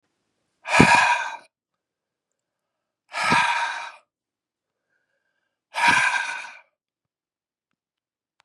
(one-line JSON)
{"exhalation_length": "8.4 s", "exhalation_amplitude": 32768, "exhalation_signal_mean_std_ratio": 0.35, "survey_phase": "beta (2021-08-13 to 2022-03-07)", "age": "18-44", "gender": "Male", "wearing_mask": "No", "symptom_cough_any": true, "symptom_runny_or_blocked_nose": true, "symptom_sore_throat": true, "symptom_abdominal_pain": true, "symptom_onset": "3 days", "smoker_status": "Ex-smoker", "respiratory_condition_asthma": false, "respiratory_condition_other": false, "recruitment_source": "Test and Trace", "submission_delay": "2 days", "covid_test_result": "Positive", "covid_test_method": "RT-qPCR", "covid_ct_value": 22.9, "covid_ct_gene": "N gene", "covid_ct_mean": 22.9, "covid_viral_load": "30000 copies/ml", "covid_viral_load_category": "Low viral load (10K-1M copies/ml)"}